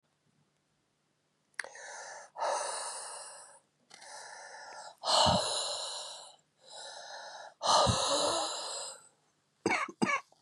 exhalation_length: 10.4 s
exhalation_amplitude: 7448
exhalation_signal_mean_std_ratio: 0.5
survey_phase: beta (2021-08-13 to 2022-03-07)
age: 45-64
gender: Female
wearing_mask: 'No'
symptom_runny_or_blocked_nose: true
symptom_sore_throat: true
symptom_fatigue: true
symptom_headache: true
symptom_change_to_sense_of_smell_or_taste: true
symptom_other: true
symptom_onset: 4 days
smoker_status: Ex-smoker
respiratory_condition_asthma: false
respiratory_condition_other: false
recruitment_source: Test and Trace
submission_delay: 2 days
covid_test_result: Positive
covid_test_method: RT-qPCR
covid_ct_value: 16.2
covid_ct_gene: ORF1ab gene
covid_ct_mean: 16.9
covid_viral_load: 2900000 copies/ml
covid_viral_load_category: High viral load (>1M copies/ml)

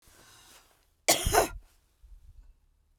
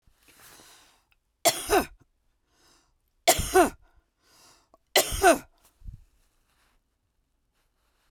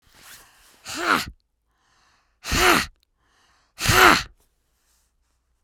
cough_length: 3.0 s
cough_amplitude: 17427
cough_signal_mean_std_ratio: 0.3
three_cough_length: 8.1 s
three_cough_amplitude: 20129
three_cough_signal_mean_std_ratio: 0.27
exhalation_length: 5.6 s
exhalation_amplitude: 32768
exhalation_signal_mean_std_ratio: 0.32
survey_phase: beta (2021-08-13 to 2022-03-07)
age: 45-64
gender: Female
wearing_mask: 'No'
symptom_cough_any: true
smoker_status: Current smoker (11 or more cigarettes per day)
respiratory_condition_asthma: false
respiratory_condition_other: false
recruitment_source: REACT
submission_delay: 1 day
covid_test_result: Negative
covid_test_method: RT-qPCR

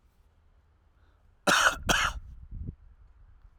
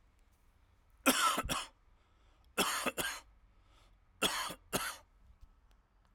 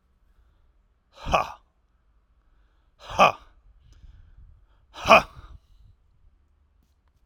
cough_length: 3.6 s
cough_amplitude: 13142
cough_signal_mean_std_ratio: 0.38
three_cough_length: 6.1 s
three_cough_amplitude: 6661
three_cough_signal_mean_std_ratio: 0.41
exhalation_length: 7.3 s
exhalation_amplitude: 32767
exhalation_signal_mean_std_ratio: 0.21
survey_phase: alpha (2021-03-01 to 2021-08-12)
age: 45-64
gender: Male
wearing_mask: 'No'
symptom_cough_any: true
smoker_status: Never smoked
respiratory_condition_asthma: true
respiratory_condition_other: false
recruitment_source: Test and Trace
submission_delay: 2 days
covid_test_result: Positive
covid_test_method: RT-qPCR
covid_ct_value: 25.4
covid_ct_gene: ORF1ab gene
covid_ct_mean: 25.7
covid_viral_load: 3800 copies/ml
covid_viral_load_category: Minimal viral load (< 10K copies/ml)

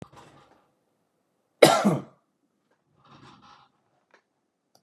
cough_length: 4.8 s
cough_amplitude: 32768
cough_signal_mean_std_ratio: 0.2
survey_phase: beta (2021-08-13 to 2022-03-07)
age: 45-64
gender: Male
wearing_mask: 'No'
symptom_none: true
smoker_status: Never smoked
respiratory_condition_asthma: false
respiratory_condition_other: false
recruitment_source: REACT
submission_delay: 1 day
covid_test_result: Negative
covid_test_method: RT-qPCR
influenza_a_test_result: Negative
influenza_b_test_result: Negative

